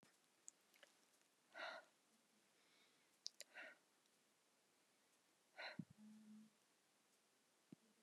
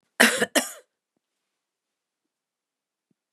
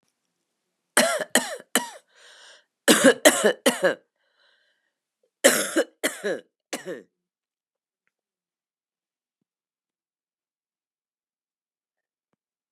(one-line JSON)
{"exhalation_length": "8.0 s", "exhalation_amplitude": 1314, "exhalation_signal_mean_std_ratio": 0.39, "cough_length": "3.3 s", "cough_amplitude": 30565, "cough_signal_mean_std_ratio": 0.22, "three_cough_length": "12.7 s", "three_cough_amplitude": 32767, "three_cough_signal_mean_std_ratio": 0.27, "survey_phase": "beta (2021-08-13 to 2022-03-07)", "age": "45-64", "gender": "Female", "wearing_mask": "Yes", "symptom_cough_any": true, "symptom_runny_or_blocked_nose": true, "symptom_sore_throat": true, "symptom_fatigue": true, "symptom_fever_high_temperature": true, "symptom_headache": true, "symptom_change_to_sense_of_smell_or_taste": true, "symptom_loss_of_taste": true, "symptom_onset": "3 days", "smoker_status": "Never smoked", "respiratory_condition_asthma": false, "respiratory_condition_other": false, "recruitment_source": "Test and Trace", "submission_delay": "2 days", "covid_test_result": "Positive", "covid_test_method": "RT-qPCR", "covid_ct_value": 17.7, "covid_ct_gene": "N gene"}